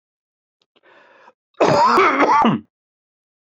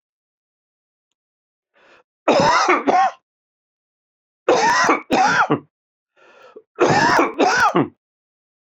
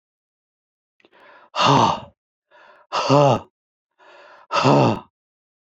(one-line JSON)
{"cough_length": "3.4 s", "cough_amplitude": 24486, "cough_signal_mean_std_ratio": 0.47, "three_cough_length": "8.8 s", "three_cough_amplitude": 25843, "three_cough_signal_mean_std_ratio": 0.48, "exhalation_length": "5.7 s", "exhalation_amplitude": 26224, "exhalation_signal_mean_std_ratio": 0.39, "survey_phase": "beta (2021-08-13 to 2022-03-07)", "age": "45-64", "gender": "Male", "wearing_mask": "No", "symptom_cough_any": true, "symptom_shortness_of_breath": true, "symptom_fatigue": true, "symptom_headache": true, "smoker_status": "Never smoked", "respiratory_condition_asthma": false, "respiratory_condition_other": false, "recruitment_source": "Test and Trace", "submission_delay": "1 day", "covid_test_result": "Positive", "covid_test_method": "RT-qPCR", "covid_ct_value": 18.8, "covid_ct_gene": "ORF1ab gene", "covid_ct_mean": 19.1, "covid_viral_load": "550000 copies/ml", "covid_viral_load_category": "Low viral load (10K-1M copies/ml)"}